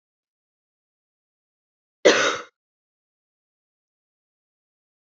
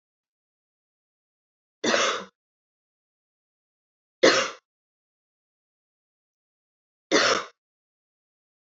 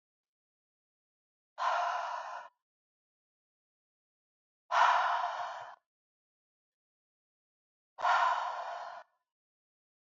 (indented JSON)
{
  "cough_length": "5.1 s",
  "cough_amplitude": 27366,
  "cough_signal_mean_std_ratio": 0.18,
  "three_cough_length": "8.8 s",
  "three_cough_amplitude": 20959,
  "three_cough_signal_mean_std_ratio": 0.24,
  "exhalation_length": "10.2 s",
  "exhalation_amplitude": 6650,
  "exhalation_signal_mean_std_ratio": 0.37,
  "survey_phase": "beta (2021-08-13 to 2022-03-07)",
  "age": "18-44",
  "gender": "Female",
  "wearing_mask": "No",
  "symptom_cough_any": true,
  "symptom_runny_or_blocked_nose": true,
  "symptom_fatigue": true,
  "symptom_headache": true,
  "symptom_change_to_sense_of_smell_or_taste": true,
  "symptom_onset": "5 days",
  "smoker_status": "Never smoked",
  "respiratory_condition_asthma": false,
  "respiratory_condition_other": false,
  "recruitment_source": "Test and Trace",
  "submission_delay": "1 day",
  "covid_test_result": "Positive",
  "covid_test_method": "RT-qPCR",
  "covid_ct_value": 17.8,
  "covid_ct_gene": "N gene",
  "covid_ct_mean": 18.0,
  "covid_viral_load": "1200000 copies/ml",
  "covid_viral_load_category": "High viral load (>1M copies/ml)"
}